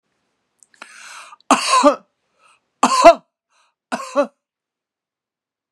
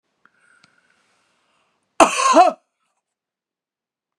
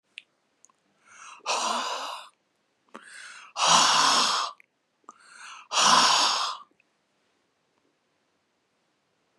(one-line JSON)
{"three_cough_length": "5.7 s", "three_cough_amplitude": 32768, "three_cough_signal_mean_std_ratio": 0.29, "cough_length": "4.2 s", "cough_amplitude": 32768, "cough_signal_mean_std_ratio": 0.25, "exhalation_length": "9.4 s", "exhalation_amplitude": 18969, "exhalation_signal_mean_std_ratio": 0.41, "survey_phase": "beta (2021-08-13 to 2022-03-07)", "age": "45-64", "gender": "Female", "wearing_mask": "No", "symptom_none": true, "smoker_status": "Prefer not to say", "respiratory_condition_asthma": false, "respiratory_condition_other": false, "recruitment_source": "REACT", "submission_delay": "2 days", "covid_test_result": "Negative", "covid_test_method": "RT-qPCR", "influenza_a_test_result": "Negative", "influenza_b_test_result": "Negative"}